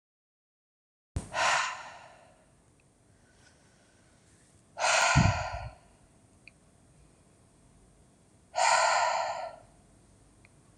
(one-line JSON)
{"exhalation_length": "10.8 s", "exhalation_amplitude": 8930, "exhalation_signal_mean_std_ratio": 0.38, "survey_phase": "alpha (2021-03-01 to 2021-08-12)", "age": "45-64", "gender": "Female", "wearing_mask": "No", "symptom_none": true, "smoker_status": "Ex-smoker", "respiratory_condition_asthma": false, "respiratory_condition_other": false, "recruitment_source": "REACT", "submission_delay": "1 day", "covid_test_result": "Negative", "covid_test_method": "RT-qPCR"}